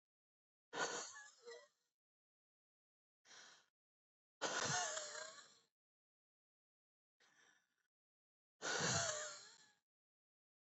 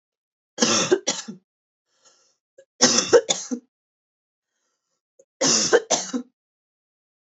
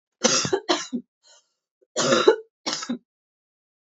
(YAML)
exhalation_length: 10.8 s
exhalation_amplitude: 1546
exhalation_signal_mean_std_ratio: 0.36
three_cough_length: 7.3 s
three_cough_amplitude: 32199
three_cough_signal_mean_std_ratio: 0.35
cough_length: 3.8 s
cough_amplitude: 28271
cough_signal_mean_std_ratio: 0.41
survey_phase: alpha (2021-03-01 to 2021-08-12)
age: 18-44
gender: Female
wearing_mask: 'No'
symptom_none: true
smoker_status: Ex-smoker
respiratory_condition_asthma: true
respiratory_condition_other: false
recruitment_source: Test and Trace
submission_delay: 2 days
covid_test_result: Positive
covid_test_method: RT-qPCR
covid_ct_value: 36.7
covid_ct_gene: ORF1ab gene